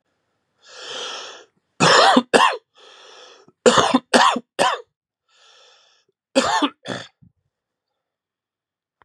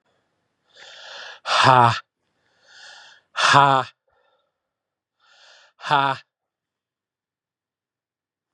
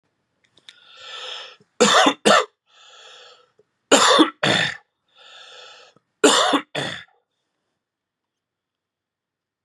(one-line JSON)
{"cough_length": "9.0 s", "cough_amplitude": 32767, "cough_signal_mean_std_ratio": 0.36, "exhalation_length": "8.5 s", "exhalation_amplitude": 32173, "exhalation_signal_mean_std_ratio": 0.29, "three_cough_length": "9.6 s", "three_cough_amplitude": 32596, "three_cough_signal_mean_std_ratio": 0.34, "survey_phase": "beta (2021-08-13 to 2022-03-07)", "age": "45-64", "gender": "Male", "wearing_mask": "No", "symptom_cough_any": true, "symptom_runny_or_blocked_nose": true, "symptom_abdominal_pain": true, "symptom_fatigue": true, "symptom_headache": true, "symptom_onset": "5 days", "smoker_status": "Ex-smoker", "respiratory_condition_asthma": false, "respiratory_condition_other": false, "recruitment_source": "REACT", "submission_delay": "2 days", "covid_test_result": "Positive", "covid_test_method": "RT-qPCR", "covid_ct_value": 19.0, "covid_ct_gene": "E gene", "influenza_a_test_result": "Negative", "influenza_b_test_result": "Negative"}